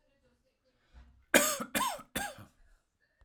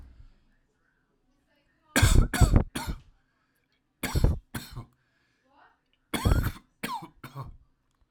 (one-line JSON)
{"cough_length": "3.2 s", "cough_amplitude": 16573, "cough_signal_mean_std_ratio": 0.33, "three_cough_length": "8.1 s", "three_cough_amplitude": 18429, "three_cough_signal_mean_std_ratio": 0.33, "survey_phase": "alpha (2021-03-01 to 2021-08-12)", "age": "18-44", "gender": "Male", "wearing_mask": "No", "symptom_none": true, "smoker_status": "Never smoked", "respiratory_condition_asthma": false, "respiratory_condition_other": false, "recruitment_source": "REACT", "submission_delay": "0 days", "covid_test_result": "Negative", "covid_test_method": "RT-qPCR"}